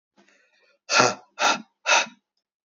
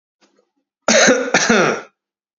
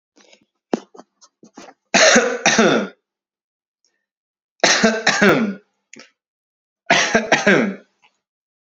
{"exhalation_length": "2.6 s", "exhalation_amplitude": 31046, "exhalation_signal_mean_std_ratio": 0.38, "cough_length": "2.4 s", "cough_amplitude": 30065, "cough_signal_mean_std_ratio": 0.5, "three_cough_length": "8.6 s", "three_cough_amplitude": 32635, "three_cough_signal_mean_std_ratio": 0.43, "survey_phase": "beta (2021-08-13 to 2022-03-07)", "age": "18-44", "gender": "Male", "wearing_mask": "No", "symptom_none": true, "smoker_status": "Never smoked", "respiratory_condition_asthma": false, "respiratory_condition_other": false, "recruitment_source": "REACT", "submission_delay": "1 day", "covid_test_result": "Negative", "covid_test_method": "RT-qPCR"}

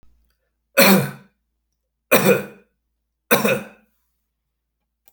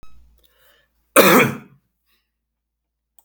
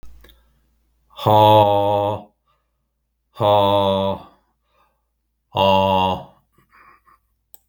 {"three_cough_length": "5.1 s", "three_cough_amplitude": 32768, "three_cough_signal_mean_std_ratio": 0.32, "cough_length": "3.2 s", "cough_amplitude": 32768, "cough_signal_mean_std_ratio": 0.28, "exhalation_length": "7.7 s", "exhalation_amplitude": 29680, "exhalation_signal_mean_std_ratio": 0.45, "survey_phase": "beta (2021-08-13 to 2022-03-07)", "age": "45-64", "gender": "Male", "wearing_mask": "No", "symptom_none": true, "smoker_status": "Never smoked", "respiratory_condition_asthma": false, "respiratory_condition_other": false, "recruitment_source": "REACT", "submission_delay": "1 day", "covid_test_result": "Negative", "covid_test_method": "RT-qPCR"}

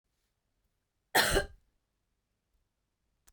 {"cough_length": "3.3 s", "cough_amplitude": 9683, "cough_signal_mean_std_ratio": 0.23, "survey_phase": "beta (2021-08-13 to 2022-03-07)", "age": "18-44", "gender": "Female", "wearing_mask": "No", "symptom_cough_any": true, "symptom_runny_or_blocked_nose": true, "symptom_headache": true, "symptom_change_to_sense_of_smell_or_taste": true, "symptom_loss_of_taste": true, "symptom_onset": "12 days", "smoker_status": "Never smoked", "respiratory_condition_asthma": false, "respiratory_condition_other": false, "recruitment_source": "REACT", "submission_delay": "1 day", "covid_test_result": "Negative", "covid_test_method": "RT-qPCR", "influenza_a_test_result": "Negative", "influenza_b_test_result": "Negative"}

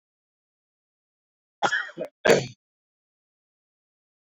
{"cough_length": "4.4 s", "cough_amplitude": 24139, "cough_signal_mean_std_ratio": 0.23, "survey_phase": "beta (2021-08-13 to 2022-03-07)", "age": "18-44", "gender": "Male", "wearing_mask": "No", "symptom_cough_any": true, "symptom_runny_or_blocked_nose": true, "symptom_shortness_of_breath": true, "symptom_sore_throat": true, "symptom_fatigue": true, "symptom_fever_high_temperature": true, "symptom_headache": true, "symptom_onset": "3 days", "smoker_status": "Current smoker (e-cigarettes or vapes only)", "respiratory_condition_asthma": false, "respiratory_condition_other": false, "recruitment_source": "Test and Trace", "submission_delay": "2 days", "covid_test_result": "Positive", "covid_test_method": "LAMP"}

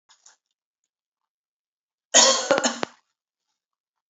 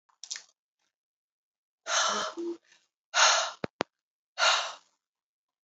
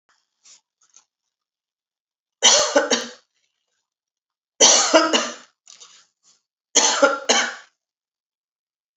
{"cough_length": "4.1 s", "cough_amplitude": 28666, "cough_signal_mean_std_ratio": 0.27, "exhalation_length": "5.6 s", "exhalation_amplitude": 15301, "exhalation_signal_mean_std_ratio": 0.37, "three_cough_length": "9.0 s", "three_cough_amplitude": 32767, "three_cough_signal_mean_std_ratio": 0.35, "survey_phase": "beta (2021-08-13 to 2022-03-07)", "age": "45-64", "gender": "Female", "wearing_mask": "No", "symptom_none": true, "smoker_status": "Never smoked", "respiratory_condition_asthma": false, "respiratory_condition_other": false, "recruitment_source": "REACT", "submission_delay": "2 days", "covid_test_result": "Negative", "covid_test_method": "RT-qPCR", "influenza_a_test_result": "Negative", "influenza_b_test_result": "Negative"}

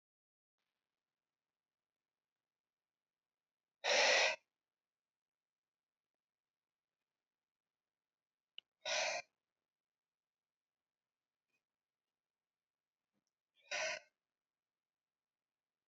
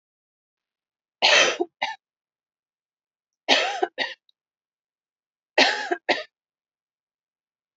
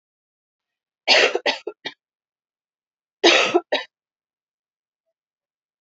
{"exhalation_length": "15.9 s", "exhalation_amplitude": 2978, "exhalation_signal_mean_std_ratio": 0.2, "three_cough_length": "7.8 s", "three_cough_amplitude": 31606, "three_cough_signal_mean_std_ratio": 0.3, "cough_length": "5.8 s", "cough_amplitude": 28495, "cough_signal_mean_std_ratio": 0.29, "survey_phase": "beta (2021-08-13 to 2022-03-07)", "age": "18-44", "gender": "Female", "wearing_mask": "No", "symptom_runny_or_blocked_nose": true, "symptom_fatigue": true, "symptom_headache": true, "smoker_status": "Current smoker (1 to 10 cigarettes per day)", "respiratory_condition_asthma": false, "respiratory_condition_other": false, "recruitment_source": "Test and Trace", "submission_delay": "2 days", "covid_test_result": "Positive", "covid_test_method": "LFT"}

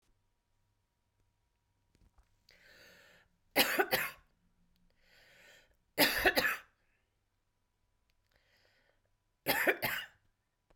{"three_cough_length": "10.8 s", "three_cough_amplitude": 10375, "three_cough_signal_mean_std_ratio": 0.29, "survey_phase": "beta (2021-08-13 to 2022-03-07)", "age": "45-64", "gender": "Female", "wearing_mask": "No", "symptom_runny_or_blocked_nose": true, "symptom_onset": "4 days", "smoker_status": "Never smoked", "respiratory_condition_asthma": false, "respiratory_condition_other": false, "recruitment_source": "REACT", "submission_delay": "2 days", "covid_test_result": "Negative", "covid_test_method": "RT-qPCR"}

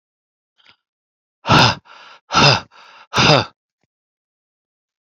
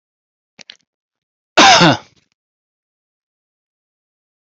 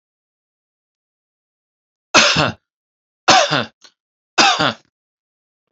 {"exhalation_length": "5.0 s", "exhalation_amplitude": 30797, "exhalation_signal_mean_std_ratio": 0.33, "cough_length": "4.4 s", "cough_amplitude": 32163, "cough_signal_mean_std_ratio": 0.25, "three_cough_length": "5.7 s", "three_cough_amplitude": 31531, "three_cough_signal_mean_std_ratio": 0.32, "survey_phase": "beta (2021-08-13 to 2022-03-07)", "age": "45-64", "gender": "Male", "wearing_mask": "No", "symptom_none": true, "smoker_status": "Never smoked", "respiratory_condition_asthma": false, "respiratory_condition_other": false, "recruitment_source": "REACT", "submission_delay": "1 day", "covid_test_result": "Negative", "covid_test_method": "RT-qPCR"}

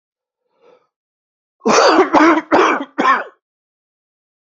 {"cough_length": "4.5 s", "cough_amplitude": 32768, "cough_signal_mean_std_ratio": 0.44, "survey_phase": "beta (2021-08-13 to 2022-03-07)", "age": "18-44", "gender": "Male", "wearing_mask": "No", "symptom_cough_any": true, "symptom_new_continuous_cough": true, "symptom_runny_or_blocked_nose": true, "symptom_shortness_of_breath": true, "symptom_fatigue": true, "symptom_headache": true, "symptom_onset": "4 days", "smoker_status": "Never smoked", "respiratory_condition_asthma": true, "respiratory_condition_other": false, "recruitment_source": "Test and Trace", "submission_delay": "2 days", "covid_test_result": "Positive", "covid_test_method": "ePCR"}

